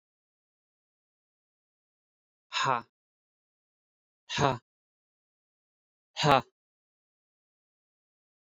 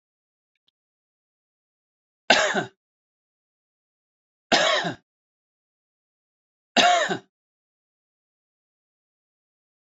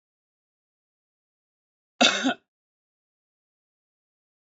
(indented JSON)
{
  "exhalation_length": "8.4 s",
  "exhalation_amplitude": 15598,
  "exhalation_signal_mean_std_ratio": 0.19,
  "three_cough_length": "9.8 s",
  "three_cough_amplitude": 29948,
  "three_cough_signal_mean_std_ratio": 0.25,
  "cough_length": "4.4 s",
  "cough_amplitude": 20799,
  "cough_signal_mean_std_ratio": 0.19,
  "survey_phase": "beta (2021-08-13 to 2022-03-07)",
  "age": "45-64",
  "gender": "Male",
  "wearing_mask": "No",
  "symptom_none": true,
  "smoker_status": "Current smoker (e-cigarettes or vapes only)",
  "respiratory_condition_asthma": false,
  "respiratory_condition_other": false,
  "recruitment_source": "REACT",
  "submission_delay": "0 days",
  "covid_test_result": "Negative",
  "covid_test_method": "RT-qPCR"
}